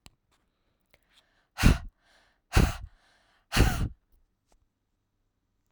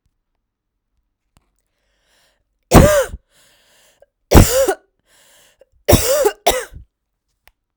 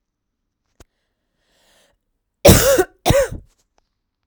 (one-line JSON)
{"exhalation_length": "5.7 s", "exhalation_amplitude": 20092, "exhalation_signal_mean_std_ratio": 0.26, "three_cough_length": "7.8 s", "three_cough_amplitude": 32768, "three_cough_signal_mean_std_ratio": 0.31, "cough_length": "4.3 s", "cough_amplitude": 32768, "cough_signal_mean_std_ratio": 0.3, "survey_phase": "beta (2021-08-13 to 2022-03-07)", "age": "18-44", "gender": "Female", "wearing_mask": "No", "symptom_cough_any": true, "symptom_runny_or_blocked_nose": true, "symptom_change_to_sense_of_smell_or_taste": true, "symptom_loss_of_taste": true, "symptom_onset": "5 days", "smoker_status": "Never smoked", "respiratory_condition_asthma": false, "respiratory_condition_other": false, "recruitment_source": "Test and Trace", "submission_delay": "2 days", "covid_test_result": "Positive", "covid_test_method": "ePCR"}